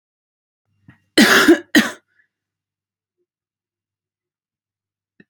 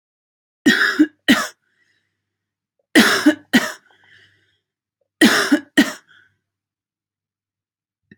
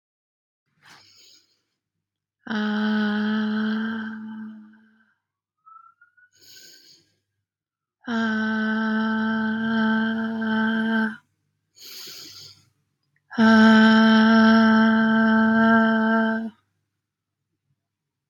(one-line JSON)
{"cough_length": "5.3 s", "cough_amplitude": 32768, "cough_signal_mean_std_ratio": 0.25, "three_cough_length": "8.2 s", "three_cough_amplitude": 31031, "three_cough_signal_mean_std_ratio": 0.33, "exhalation_length": "18.3 s", "exhalation_amplitude": 17011, "exhalation_signal_mean_std_ratio": 0.61, "survey_phase": "alpha (2021-03-01 to 2021-08-12)", "age": "18-44", "gender": "Female", "wearing_mask": "No", "symptom_none": true, "smoker_status": "Never smoked", "respiratory_condition_asthma": false, "respiratory_condition_other": false, "recruitment_source": "REACT", "submission_delay": "1 day", "covid_test_result": "Negative", "covid_test_method": "RT-qPCR"}